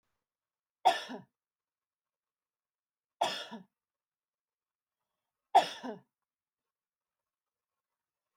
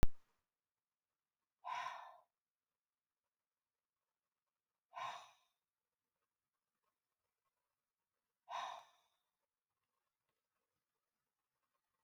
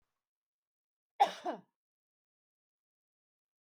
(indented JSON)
{
  "three_cough_length": "8.4 s",
  "three_cough_amplitude": 8860,
  "three_cough_signal_mean_std_ratio": 0.18,
  "exhalation_length": "12.0 s",
  "exhalation_amplitude": 3720,
  "exhalation_signal_mean_std_ratio": 0.14,
  "cough_length": "3.7 s",
  "cough_amplitude": 6283,
  "cough_signal_mean_std_ratio": 0.16,
  "survey_phase": "beta (2021-08-13 to 2022-03-07)",
  "age": "45-64",
  "gender": "Female",
  "wearing_mask": "No",
  "symptom_none": true,
  "smoker_status": "Never smoked",
  "respiratory_condition_asthma": false,
  "respiratory_condition_other": false,
  "recruitment_source": "REACT",
  "submission_delay": "2 days",
  "covid_test_result": "Negative",
  "covid_test_method": "RT-qPCR",
  "influenza_a_test_result": "Negative",
  "influenza_b_test_result": "Negative"
}